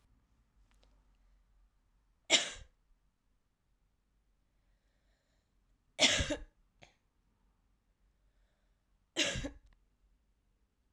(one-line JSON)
{"three_cough_length": "10.9 s", "three_cough_amplitude": 9432, "three_cough_signal_mean_std_ratio": 0.22, "survey_phase": "alpha (2021-03-01 to 2021-08-12)", "age": "18-44", "gender": "Female", "wearing_mask": "No", "symptom_cough_any": true, "symptom_headache": true, "symptom_onset": "4 days", "smoker_status": "Never smoked", "respiratory_condition_asthma": false, "respiratory_condition_other": false, "recruitment_source": "Test and Trace", "submission_delay": "2 days", "covid_test_result": "Positive", "covid_test_method": "RT-qPCR"}